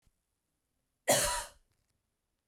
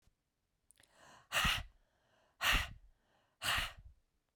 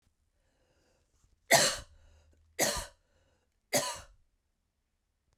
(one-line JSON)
{"cough_length": "2.5 s", "cough_amplitude": 7544, "cough_signal_mean_std_ratio": 0.29, "exhalation_length": "4.4 s", "exhalation_amplitude": 4112, "exhalation_signal_mean_std_ratio": 0.37, "three_cough_length": "5.4 s", "three_cough_amplitude": 11480, "three_cough_signal_mean_std_ratio": 0.27, "survey_phase": "beta (2021-08-13 to 2022-03-07)", "age": "18-44", "gender": "Female", "wearing_mask": "No", "symptom_cough_any": true, "symptom_runny_or_blocked_nose": true, "symptom_fatigue": true, "symptom_onset": "5 days", "smoker_status": "Ex-smoker", "respiratory_condition_asthma": false, "respiratory_condition_other": false, "recruitment_source": "Test and Trace", "submission_delay": "2 days", "covid_test_result": "Positive", "covid_test_method": "RT-qPCR", "covid_ct_value": 23.8, "covid_ct_gene": "ORF1ab gene"}